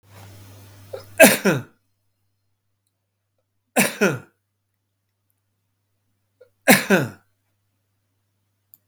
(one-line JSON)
{"three_cough_length": "8.9 s", "three_cough_amplitude": 32768, "three_cough_signal_mean_std_ratio": 0.25, "survey_phase": "beta (2021-08-13 to 2022-03-07)", "age": "65+", "gender": "Male", "wearing_mask": "No", "symptom_cough_any": true, "symptom_headache": true, "symptom_onset": "12 days", "smoker_status": "Ex-smoker", "respiratory_condition_asthma": false, "respiratory_condition_other": true, "recruitment_source": "REACT", "submission_delay": "1 day", "covid_test_result": "Negative", "covid_test_method": "RT-qPCR", "influenza_a_test_result": "Negative", "influenza_b_test_result": "Negative"}